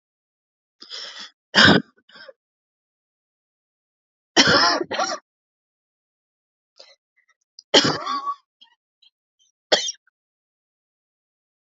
{"three_cough_length": "11.6 s", "three_cough_amplitude": 32768, "three_cough_signal_mean_std_ratio": 0.27, "survey_phase": "alpha (2021-03-01 to 2021-08-12)", "age": "18-44", "gender": "Female", "wearing_mask": "No", "symptom_cough_any": true, "symptom_new_continuous_cough": true, "symptom_shortness_of_breath": true, "symptom_fatigue": true, "symptom_fever_high_temperature": true, "symptom_headache": true, "symptom_change_to_sense_of_smell_or_taste": true, "symptom_loss_of_taste": true, "symptom_onset": "4 days", "smoker_status": "Ex-smoker", "respiratory_condition_asthma": true, "respiratory_condition_other": false, "recruitment_source": "Test and Trace", "submission_delay": "2 days", "covid_test_result": "Positive", "covid_test_method": "RT-qPCR"}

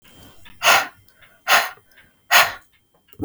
{"exhalation_length": "3.2 s", "exhalation_amplitude": 32768, "exhalation_signal_mean_std_ratio": 0.36, "survey_phase": "beta (2021-08-13 to 2022-03-07)", "age": "45-64", "gender": "Female", "wearing_mask": "No", "symptom_sore_throat": true, "symptom_onset": "3 days", "smoker_status": "Never smoked", "respiratory_condition_asthma": false, "respiratory_condition_other": false, "recruitment_source": "REACT", "submission_delay": "2 days", "covid_test_result": "Negative", "covid_test_method": "RT-qPCR", "influenza_a_test_result": "Negative", "influenza_b_test_result": "Negative"}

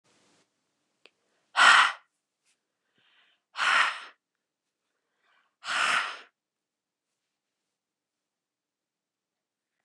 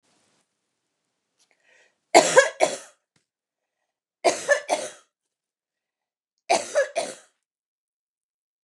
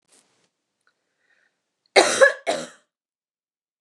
{"exhalation_length": "9.8 s", "exhalation_amplitude": 20539, "exhalation_signal_mean_std_ratio": 0.25, "three_cough_length": "8.6 s", "three_cough_amplitude": 29133, "three_cough_signal_mean_std_ratio": 0.26, "cough_length": "3.8 s", "cough_amplitude": 29173, "cough_signal_mean_std_ratio": 0.25, "survey_phase": "beta (2021-08-13 to 2022-03-07)", "age": "45-64", "gender": "Female", "wearing_mask": "No", "symptom_none": true, "smoker_status": "Never smoked", "respiratory_condition_asthma": false, "respiratory_condition_other": false, "recruitment_source": "REACT", "submission_delay": "2 days", "covid_test_result": "Negative", "covid_test_method": "RT-qPCR", "influenza_a_test_result": "Negative", "influenza_b_test_result": "Negative"}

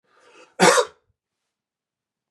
{"cough_length": "2.3 s", "cough_amplitude": 26711, "cough_signal_mean_std_ratio": 0.26, "survey_phase": "beta (2021-08-13 to 2022-03-07)", "age": "18-44", "gender": "Male", "wearing_mask": "No", "symptom_none": true, "smoker_status": "Ex-smoker", "respiratory_condition_asthma": true, "respiratory_condition_other": false, "recruitment_source": "REACT", "submission_delay": "1 day", "covid_test_result": "Negative", "covid_test_method": "RT-qPCR", "influenza_a_test_result": "Negative", "influenza_b_test_result": "Negative"}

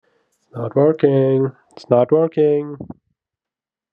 {"three_cough_length": "3.9 s", "three_cough_amplitude": 29427, "three_cough_signal_mean_std_ratio": 0.53, "survey_phase": "beta (2021-08-13 to 2022-03-07)", "age": "18-44", "gender": "Male", "wearing_mask": "No", "symptom_cough_any": true, "symptom_runny_or_blocked_nose": true, "symptom_headache": true, "smoker_status": "Never smoked", "respiratory_condition_asthma": false, "respiratory_condition_other": false, "recruitment_source": "Test and Trace", "submission_delay": "1 day", "covid_test_result": "Positive", "covid_test_method": "LFT"}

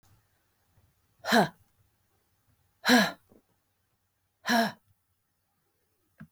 {"exhalation_length": "6.3 s", "exhalation_amplitude": 12229, "exhalation_signal_mean_std_ratio": 0.26, "survey_phase": "beta (2021-08-13 to 2022-03-07)", "age": "45-64", "gender": "Female", "wearing_mask": "No", "symptom_cough_any": true, "symptom_shortness_of_breath": true, "symptom_fatigue": true, "smoker_status": "Never smoked", "respiratory_condition_asthma": true, "respiratory_condition_other": false, "recruitment_source": "REACT", "submission_delay": "2 days", "covid_test_result": "Negative", "covid_test_method": "RT-qPCR", "influenza_a_test_result": "Negative", "influenza_b_test_result": "Negative"}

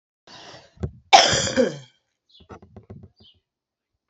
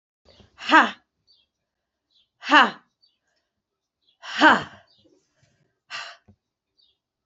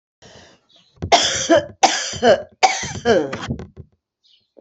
{"cough_length": "4.1 s", "cough_amplitude": 29481, "cough_signal_mean_std_ratio": 0.29, "exhalation_length": "7.3 s", "exhalation_amplitude": 27326, "exhalation_signal_mean_std_ratio": 0.23, "three_cough_length": "4.6 s", "three_cough_amplitude": 31394, "three_cough_signal_mean_std_ratio": 0.47, "survey_phase": "alpha (2021-03-01 to 2021-08-12)", "age": "45-64", "gender": "Female", "wearing_mask": "No", "symptom_cough_any": true, "symptom_fatigue": true, "smoker_status": "Never smoked", "respiratory_condition_asthma": true, "respiratory_condition_other": false, "recruitment_source": "Test and Trace", "submission_delay": "2 days", "covid_test_result": "Positive", "covid_test_method": "RT-qPCR", "covid_ct_value": 22.8, "covid_ct_gene": "ORF1ab gene", "covid_ct_mean": 23.5, "covid_viral_load": "19000 copies/ml", "covid_viral_load_category": "Low viral load (10K-1M copies/ml)"}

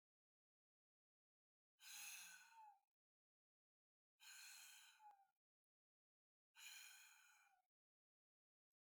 {"exhalation_length": "8.9 s", "exhalation_amplitude": 190, "exhalation_signal_mean_std_ratio": 0.43, "survey_phase": "beta (2021-08-13 to 2022-03-07)", "age": "65+", "gender": "Male", "wearing_mask": "No", "symptom_runny_or_blocked_nose": true, "smoker_status": "Ex-smoker", "respiratory_condition_asthma": false, "respiratory_condition_other": false, "recruitment_source": "REACT", "submission_delay": "1 day", "covid_test_result": "Negative", "covid_test_method": "RT-qPCR", "influenza_a_test_result": "Negative", "influenza_b_test_result": "Negative"}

